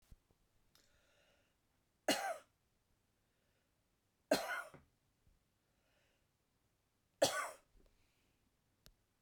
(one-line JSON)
{"three_cough_length": "9.2 s", "three_cough_amplitude": 3723, "three_cough_signal_mean_std_ratio": 0.23, "survey_phase": "beta (2021-08-13 to 2022-03-07)", "age": "65+", "gender": "Female", "wearing_mask": "No", "symptom_none": true, "smoker_status": "Ex-smoker", "respiratory_condition_asthma": false, "respiratory_condition_other": false, "recruitment_source": "REACT", "submission_delay": "1 day", "covid_test_result": "Negative", "covid_test_method": "RT-qPCR", "influenza_a_test_result": "Negative", "influenza_b_test_result": "Negative"}